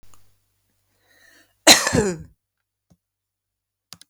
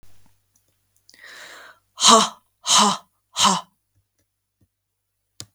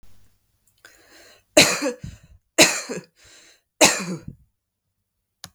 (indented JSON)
{
  "cough_length": "4.1 s",
  "cough_amplitude": 32768,
  "cough_signal_mean_std_ratio": 0.23,
  "exhalation_length": "5.5 s",
  "exhalation_amplitude": 32768,
  "exhalation_signal_mean_std_ratio": 0.3,
  "three_cough_length": "5.5 s",
  "three_cough_amplitude": 32768,
  "three_cough_signal_mean_std_ratio": 0.29,
  "survey_phase": "beta (2021-08-13 to 2022-03-07)",
  "age": "45-64",
  "gender": "Female",
  "wearing_mask": "No",
  "symptom_none": true,
  "smoker_status": "Ex-smoker",
  "respiratory_condition_asthma": false,
  "respiratory_condition_other": false,
  "recruitment_source": "REACT",
  "submission_delay": "2 days",
  "covid_test_result": "Negative",
  "covid_test_method": "RT-qPCR"
}